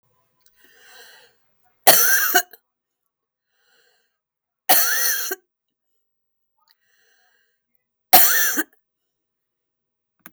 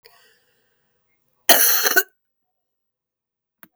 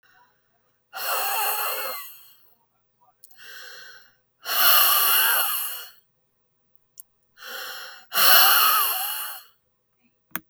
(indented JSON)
{
  "three_cough_length": "10.3 s",
  "three_cough_amplitude": 32768,
  "three_cough_signal_mean_std_ratio": 0.3,
  "cough_length": "3.8 s",
  "cough_amplitude": 32768,
  "cough_signal_mean_std_ratio": 0.28,
  "exhalation_length": "10.5 s",
  "exhalation_amplitude": 30901,
  "exhalation_signal_mean_std_ratio": 0.46,
  "survey_phase": "beta (2021-08-13 to 2022-03-07)",
  "age": "65+",
  "gender": "Female",
  "wearing_mask": "No",
  "symptom_cough_any": true,
  "smoker_status": "Never smoked",
  "respiratory_condition_asthma": true,
  "respiratory_condition_other": false,
  "recruitment_source": "REACT",
  "submission_delay": "2 days",
  "covid_test_result": "Negative",
  "covid_test_method": "RT-qPCR",
  "influenza_a_test_result": "Negative",
  "influenza_b_test_result": "Negative"
}